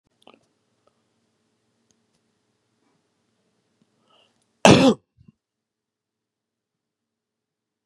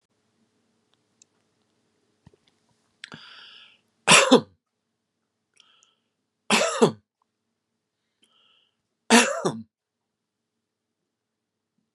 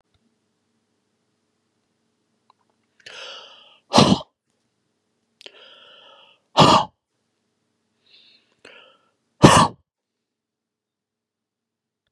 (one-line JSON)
{"cough_length": "7.9 s", "cough_amplitude": 32768, "cough_signal_mean_std_ratio": 0.15, "three_cough_length": "11.9 s", "three_cough_amplitude": 29981, "three_cough_signal_mean_std_ratio": 0.21, "exhalation_length": "12.1 s", "exhalation_amplitude": 32768, "exhalation_signal_mean_std_ratio": 0.2, "survey_phase": "beta (2021-08-13 to 2022-03-07)", "age": "65+", "gender": "Male", "wearing_mask": "No", "symptom_cough_any": true, "symptom_runny_or_blocked_nose": true, "symptom_onset": "3 days", "smoker_status": "Never smoked", "respiratory_condition_asthma": false, "respiratory_condition_other": false, "recruitment_source": "Test and Trace", "submission_delay": "2 days", "covid_test_result": "Negative", "covid_test_method": "RT-qPCR"}